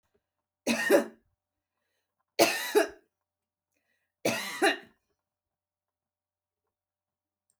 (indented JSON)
{
  "three_cough_length": "7.6 s",
  "three_cough_amplitude": 16259,
  "three_cough_signal_mean_std_ratio": 0.29,
  "survey_phase": "alpha (2021-03-01 to 2021-08-12)",
  "age": "45-64",
  "gender": "Female",
  "wearing_mask": "No",
  "symptom_none": true,
  "symptom_fatigue": true,
  "smoker_status": "Never smoked",
  "respiratory_condition_asthma": true,
  "respiratory_condition_other": false,
  "recruitment_source": "REACT",
  "submission_delay": "2 days",
  "covid_test_result": "Negative",
  "covid_test_method": "RT-qPCR"
}